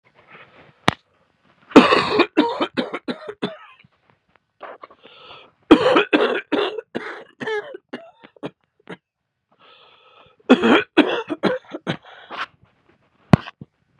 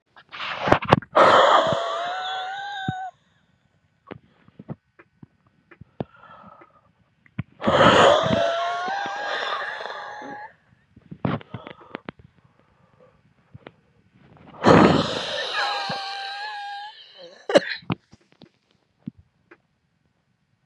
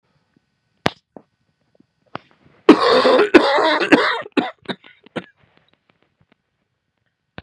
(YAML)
three_cough_length: 14.0 s
three_cough_amplitude: 32768
three_cough_signal_mean_std_ratio: 0.34
exhalation_length: 20.7 s
exhalation_amplitude: 32768
exhalation_signal_mean_std_ratio: 0.4
cough_length: 7.4 s
cough_amplitude: 32768
cough_signal_mean_std_ratio: 0.34
survey_phase: beta (2021-08-13 to 2022-03-07)
age: 45-64
gender: Male
wearing_mask: 'No'
symptom_cough_any: true
symptom_headache: true
symptom_onset: 2 days
smoker_status: Never smoked
respiratory_condition_asthma: false
respiratory_condition_other: false
recruitment_source: Test and Trace
submission_delay: 2 days
covid_test_result: Positive
covid_test_method: RT-qPCR
covid_ct_value: 17.8
covid_ct_gene: ORF1ab gene